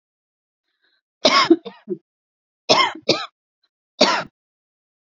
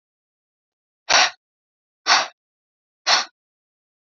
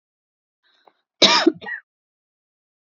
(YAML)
three_cough_length: 5.0 s
three_cough_amplitude: 30076
three_cough_signal_mean_std_ratio: 0.32
exhalation_length: 4.2 s
exhalation_amplitude: 26258
exhalation_signal_mean_std_ratio: 0.28
cough_length: 3.0 s
cough_amplitude: 30436
cough_signal_mean_std_ratio: 0.25
survey_phase: beta (2021-08-13 to 2022-03-07)
age: 18-44
gender: Female
wearing_mask: 'No'
symptom_none: true
smoker_status: Ex-smoker
respiratory_condition_asthma: false
respiratory_condition_other: false
recruitment_source: REACT
submission_delay: 1 day
covid_test_result: Negative
covid_test_method: RT-qPCR